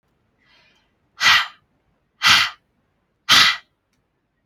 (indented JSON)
{
  "exhalation_length": "4.5 s",
  "exhalation_amplitude": 32035,
  "exhalation_signal_mean_std_ratio": 0.33,
  "survey_phase": "alpha (2021-03-01 to 2021-08-12)",
  "age": "18-44",
  "gender": "Female",
  "wearing_mask": "No",
  "symptom_none": true,
  "smoker_status": "Never smoked",
  "respiratory_condition_asthma": true,
  "respiratory_condition_other": false,
  "recruitment_source": "REACT",
  "submission_delay": "2 days",
  "covid_test_result": "Negative",
  "covid_test_method": "RT-qPCR"
}